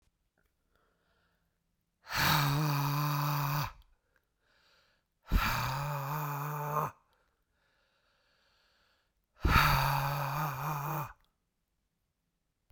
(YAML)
exhalation_length: 12.7 s
exhalation_amplitude: 9135
exhalation_signal_mean_std_ratio: 0.52
survey_phase: beta (2021-08-13 to 2022-03-07)
age: 18-44
gender: Male
wearing_mask: 'No'
symptom_none: true
smoker_status: Ex-smoker
respiratory_condition_asthma: false
respiratory_condition_other: false
recruitment_source: REACT
submission_delay: 1 day
covid_test_result: Negative
covid_test_method: RT-qPCR